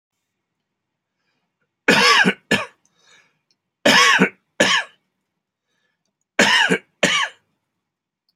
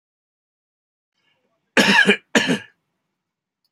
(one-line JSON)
{"three_cough_length": "8.4 s", "three_cough_amplitude": 32768, "three_cough_signal_mean_std_ratio": 0.38, "cough_length": "3.7 s", "cough_amplitude": 28294, "cough_signal_mean_std_ratio": 0.31, "survey_phase": "beta (2021-08-13 to 2022-03-07)", "age": "45-64", "gender": "Male", "wearing_mask": "No", "symptom_fatigue": true, "smoker_status": "Ex-smoker", "respiratory_condition_asthma": false, "respiratory_condition_other": false, "recruitment_source": "REACT", "submission_delay": "2 days", "covid_test_result": "Negative", "covid_test_method": "RT-qPCR"}